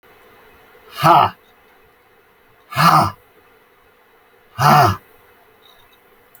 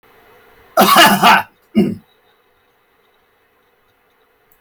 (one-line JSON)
{"exhalation_length": "6.4 s", "exhalation_amplitude": 29228, "exhalation_signal_mean_std_ratio": 0.34, "cough_length": "4.6 s", "cough_amplitude": 32768, "cough_signal_mean_std_ratio": 0.35, "survey_phase": "beta (2021-08-13 to 2022-03-07)", "age": "65+", "gender": "Male", "wearing_mask": "No", "symptom_none": true, "smoker_status": "Never smoked", "respiratory_condition_asthma": false, "respiratory_condition_other": false, "recruitment_source": "REACT", "submission_delay": "2 days", "covid_test_result": "Negative", "covid_test_method": "RT-qPCR"}